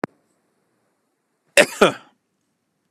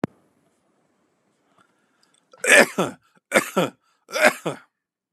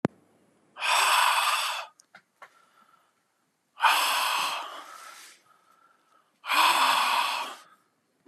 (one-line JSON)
{"cough_length": "2.9 s", "cough_amplitude": 32768, "cough_signal_mean_std_ratio": 0.19, "three_cough_length": "5.1 s", "three_cough_amplitude": 32767, "three_cough_signal_mean_std_ratio": 0.28, "exhalation_length": "8.3 s", "exhalation_amplitude": 14099, "exhalation_signal_mean_std_ratio": 0.51, "survey_phase": "beta (2021-08-13 to 2022-03-07)", "age": "18-44", "gender": "Male", "wearing_mask": "No", "symptom_none": true, "smoker_status": "Never smoked", "respiratory_condition_asthma": false, "respiratory_condition_other": false, "recruitment_source": "REACT", "submission_delay": "0 days", "covid_test_result": "Negative", "covid_test_method": "RT-qPCR", "influenza_a_test_result": "Negative", "influenza_b_test_result": "Negative"}